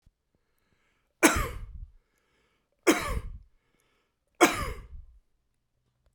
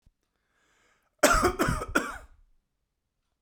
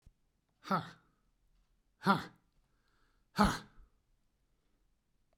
three_cough_length: 6.1 s
three_cough_amplitude: 17191
three_cough_signal_mean_std_ratio: 0.29
cough_length: 3.4 s
cough_amplitude: 16582
cough_signal_mean_std_ratio: 0.36
exhalation_length: 5.4 s
exhalation_amplitude: 6684
exhalation_signal_mean_std_ratio: 0.24
survey_phase: beta (2021-08-13 to 2022-03-07)
age: 65+
gender: Male
wearing_mask: 'No'
symptom_none: true
smoker_status: Never smoked
respiratory_condition_asthma: false
respiratory_condition_other: false
recruitment_source: REACT
submission_delay: 1 day
covid_test_result: Negative
covid_test_method: RT-qPCR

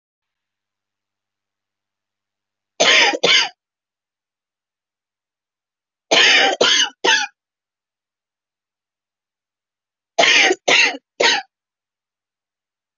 three_cough_length: 13.0 s
three_cough_amplitude: 27647
three_cough_signal_mean_std_ratio: 0.35
survey_phase: beta (2021-08-13 to 2022-03-07)
age: 45-64
gender: Female
wearing_mask: 'No'
symptom_cough_any: true
symptom_shortness_of_breath: true
symptom_abdominal_pain: true
symptom_fatigue: true
symptom_headache: true
symptom_other: true
symptom_onset: 13 days
smoker_status: Ex-smoker
respiratory_condition_asthma: true
respiratory_condition_other: false
recruitment_source: REACT
submission_delay: 1 day
covid_test_result: Negative
covid_test_method: RT-qPCR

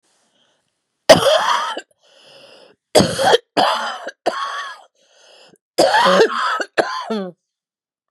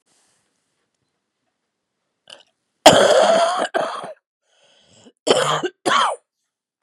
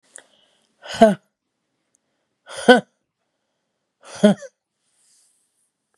three_cough_length: 8.1 s
three_cough_amplitude: 32768
three_cough_signal_mean_std_ratio: 0.46
cough_length: 6.8 s
cough_amplitude: 32768
cough_signal_mean_std_ratio: 0.38
exhalation_length: 6.0 s
exhalation_amplitude: 32767
exhalation_signal_mean_std_ratio: 0.2
survey_phase: beta (2021-08-13 to 2022-03-07)
age: 45-64
gender: Female
wearing_mask: 'No'
symptom_cough_any: true
symptom_new_continuous_cough: true
symptom_sore_throat: true
symptom_abdominal_pain: true
symptom_fatigue: true
symptom_headache: true
symptom_loss_of_taste: true
symptom_onset: 2 days
smoker_status: Never smoked
respiratory_condition_asthma: false
respiratory_condition_other: false
recruitment_source: Test and Trace
submission_delay: 1 day
covid_test_result: Positive
covid_test_method: RT-qPCR
covid_ct_value: 14.3
covid_ct_gene: N gene
covid_ct_mean: 14.6
covid_viral_load: 16000000 copies/ml
covid_viral_load_category: High viral load (>1M copies/ml)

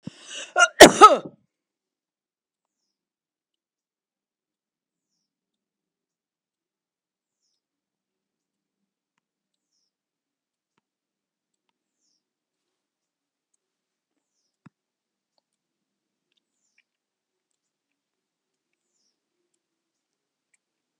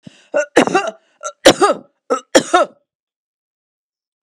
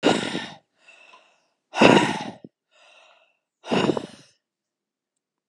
cough_length: 21.0 s
cough_amplitude: 32768
cough_signal_mean_std_ratio: 0.1
three_cough_length: 4.3 s
three_cough_amplitude: 32768
three_cough_signal_mean_std_ratio: 0.35
exhalation_length: 5.5 s
exhalation_amplitude: 32768
exhalation_signal_mean_std_ratio: 0.32
survey_phase: alpha (2021-03-01 to 2021-08-12)
age: 65+
gender: Female
wearing_mask: 'No'
symptom_none: true
smoker_status: Ex-smoker
respiratory_condition_asthma: false
respiratory_condition_other: false
recruitment_source: REACT
submission_delay: 2 days
covid_test_result: Negative
covid_test_method: RT-qPCR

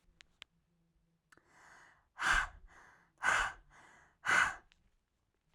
exhalation_length: 5.5 s
exhalation_amplitude: 5010
exhalation_signal_mean_std_ratio: 0.33
survey_phase: beta (2021-08-13 to 2022-03-07)
age: 18-44
gender: Female
wearing_mask: 'No'
symptom_none: true
smoker_status: Current smoker (e-cigarettes or vapes only)
respiratory_condition_asthma: false
respiratory_condition_other: false
recruitment_source: REACT
submission_delay: 0 days
covid_test_result: Negative
covid_test_method: RT-qPCR
influenza_a_test_result: Negative
influenza_b_test_result: Negative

